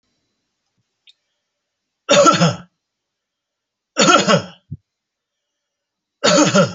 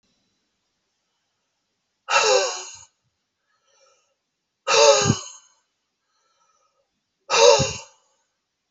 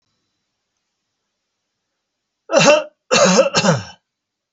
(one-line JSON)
{"three_cough_length": "6.7 s", "three_cough_amplitude": 32768, "three_cough_signal_mean_std_ratio": 0.36, "exhalation_length": "8.7 s", "exhalation_amplitude": 27918, "exhalation_signal_mean_std_ratio": 0.31, "cough_length": "4.5 s", "cough_amplitude": 30703, "cough_signal_mean_std_ratio": 0.38, "survey_phase": "alpha (2021-03-01 to 2021-08-12)", "age": "65+", "gender": "Male", "wearing_mask": "No", "symptom_none": true, "smoker_status": "Never smoked", "respiratory_condition_asthma": true, "respiratory_condition_other": false, "recruitment_source": "REACT", "submission_delay": "2 days", "covid_test_result": "Negative", "covid_test_method": "RT-qPCR"}